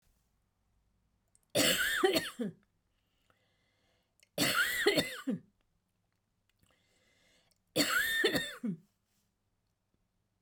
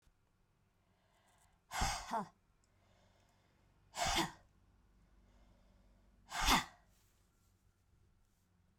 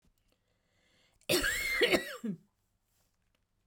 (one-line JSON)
{"three_cough_length": "10.4 s", "three_cough_amplitude": 6369, "three_cough_signal_mean_std_ratio": 0.41, "exhalation_length": "8.8 s", "exhalation_amplitude": 5309, "exhalation_signal_mean_std_ratio": 0.29, "cough_length": "3.7 s", "cough_amplitude": 7161, "cough_signal_mean_std_ratio": 0.4, "survey_phase": "beta (2021-08-13 to 2022-03-07)", "age": "45-64", "gender": "Female", "wearing_mask": "No", "symptom_none": true, "smoker_status": "Never smoked", "respiratory_condition_asthma": false, "respiratory_condition_other": false, "recruitment_source": "REACT", "submission_delay": "2 days", "covid_test_result": "Negative", "covid_test_method": "RT-qPCR"}